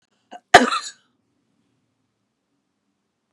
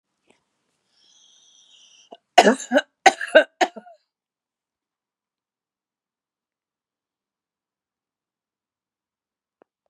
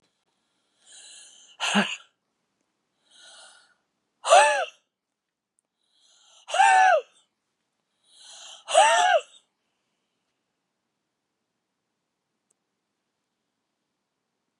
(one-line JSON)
{"cough_length": "3.3 s", "cough_amplitude": 32768, "cough_signal_mean_std_ratio": 0.17, "three_cough_length": "9.9 s", "three_cough_amplitude": 32768, "three_cough_signal_mean_std_ratio": 0.17, "exhalation_length": "14.6 s", "exhalation_amplitude": 21938, "exhalation_signal_mean_std_ratio": 0.27, "survey_phase": "beta (2021-08-13 to 2022-03-07)", "age": "45-64", "gender": "Female", "wearing_mask": "No", "symptom_none": true, "smoker_status": "Ex-smoker", "respiratory_condition_asthma": false, "respiratory_condition_other": false, "recruitment_source": "REACT", "submission_delay": "3 days", "covid_test_result": "Negative", "covid_test_method": "RT-qPCR", "influenza_a_test_result": "Unknown/Void", "influenza_b_test_result": "Unknown/Void"}